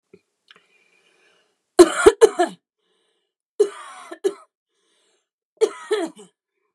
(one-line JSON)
{"three_cough_length": "6.7 s", "three_cough_amplitude": 29204, "three_cough_signal_mean_std_ratio": 0.24, "survey_phase": "beta (2021-08-13 to 2022-03-07)", "age": "18-44", "gender": "Female", "wearing_mask": "No", "symptom_new_continuous_cough": true, "symptom_runny_or_blocked_nose": true, "symptom_sore_throat": true, "symptom_fatigue": true, "symptom_headache": true, "symptom_onset": "2 days", "smoker_status": "Ex-smoker", "respiratory_condition_asthma": false, "respiratory_condition_other": false, "recruitment_source": "Test and Trace", "submission_delay": "1 day", "covid_test_result": "Positive", "covid_test_method": "RT-qPCR", "covid_ct_value": 25.0, "covid_ct_gene": "ORF1ab gene"}